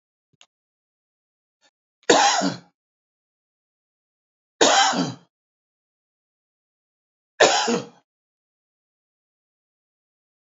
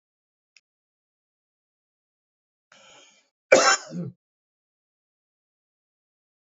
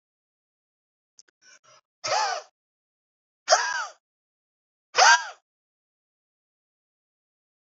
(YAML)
three_cough_length: 10.4 s
three_cough_amplitude: 30457
three_cough_signal_mean_std_ratio: 0.27
cough_length: 6.6 s
cough_amplitude: 28211
cough_signal_mean_std_ratio: 0.17
exhalation_length: 7.7 s
exhalation_amplitude: 21481
exhalation_signal_mean_std_ratio: 0.24
survey_phase: beta (2021-08-13 to 2022-03-07)
age: 65+
gender: Male
wearing_mask: 'No'
symptom_cough_any: true
symptom_shortness_of_breath: true
smoker_status: Never smoked
respiratory_condition_asthma: false
respiratory_condition_other: false
recruitment_source: REACT
submission_delay: 2 days
covid_test_result: Negative
covid_test_method: RT-qPCR
influenza_a_test_result: Negative
influenza_b_test_result: Negative